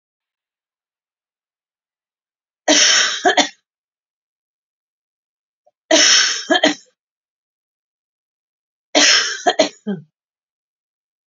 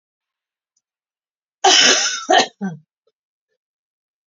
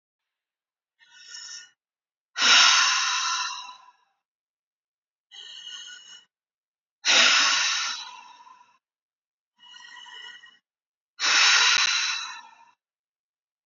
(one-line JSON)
{"three_cough_length": "11.3 s", "three_cough_amplitude": 32768, "three_cough_signal_mean_std_ratio": 0.34, "cough_length": "4.3 s", "cough_amplitude": 31172, "cough_signal_mean_std_ratio": 0.34, "exhalation_length": "13.7 s", "exhalation_amplitude": 19967, "exhalation_signal_mean_std_ratio": 0.4, "survey_phase": "beta (2021-08-13 to 2022-03-07)", "age": "45-64", "gender": "Female", "wearing_mask": "No", "symptom_none": true, "smoker_status": "Ex-smoker", "respiratory_condition_asthma": true, "respiratory_condition_other": false, "recruitment_source": "REACT", "submission_delay": "3 days", "covid_test_result": "Negative", "covid_test_method": "RT-qPCR"}